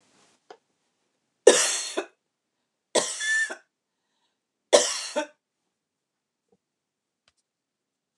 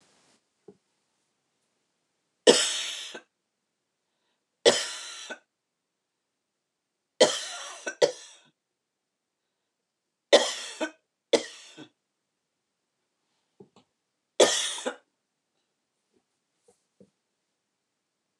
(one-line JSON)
{"three_cough_length": "8.2 s", "three_cough_amplitude": 29203, "three_cough_signal_mean_std_ratio": 0.26, "cough_length": "18.4 s", "cough_amplitude": 24871, "cough_signal_mean_std_ratio": 0.22, "survey_phase": "beta (2021-08-13 to 2022-03-07)", "age": "65+", "gender": "Female", "wearing_mask": "No", "symptom_runny_or_blocked_nose": true, "symptom_onset": "6 days", "smoker_status": "Ex-smoker", "respiratory_condition_asthma": false, "respiratory_condition_other": false, "recruitment_source": "REACT", "submission_delay": "3 days", "covid_test_result": "Negative", "covid_test_method": "RT-qPCR", "influenza_a_test_result": "Negative", "influenza_b_test_result": "Negative"}